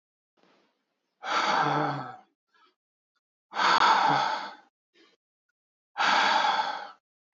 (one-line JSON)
{"exhalation_length": "7.3 s", "exhalation_amplitude": 10212, "exhalation_signal_mean_std_ratio": 0.49, "survey_phase": "alpha (2021-03-01 to 2021-08-12)", "age": "45-64", "gender": "Male", "wearing_mask": "No", "symptom_cough_any": true, "symptom_diarrhoea": true, "smoker_status": "Never smoked", "respiratory_condition_asthma": false, "respiratory_condition_other": false, "recruitment_source": "Test and Trace", "submission_delay": "2 days", "covid_test_result": "Positive", "covid_test_method": "ePCR"}